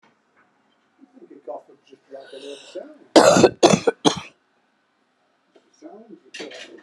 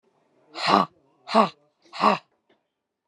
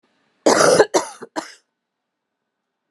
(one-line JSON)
{"cough_length": "6.8 s", "cough_amplitude": 32767, "cough_signal_mean_std_ratio": 0.27, "exhalation_length": "3.1 s", "exhalation_amplitude": 28437, "exhalation_signal_mean_std_ratio": 0.33, "three_cough_length": "2.9 s", "three_cough_amplitude": 31731, "three_cough_signal_mean_std_ratio": 0.34, "survey_phase": "beta (2021-08-13 to 2022-03-07)", "age": "45-64", "gender": "Female", "wearing_mask": "No", "symptom_cough_any": true, "symptom_runny_or_blocked_nose": true, "symptom_sore_throat": true, "symptom_diarrhoea": true, "symptom_change_to_sense_of_smell_or_taste": true, "smoker_status": "Ex-smoker", "respiratory_condition_asthma": false, "respiratory_condition_other": false, "recruitment_source": "Test and Trace", "submission_delay": "2 days", "covid_test_result": "Positive", "covid_test_method": "LFT"}